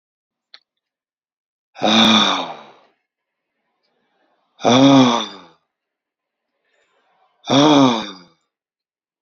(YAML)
exhalation_length: 9.2 s
exhalation_amplitude: 32767
exhalation_signal_mean_std_ratio: 0.36
survey_phase: beta (2021-08-13 to 2022-03-07)
age: 65+
gender: Male
wearing_mask: 'No'
symptom_none: true
smoker_status: Never smoked
respiratory_condition_asthma: false
respiratory_condition_other: false
recruitment_source: REACT
submission_delay: 2 days
covid_test_result: Negative
covid_test_method: RT-qPCR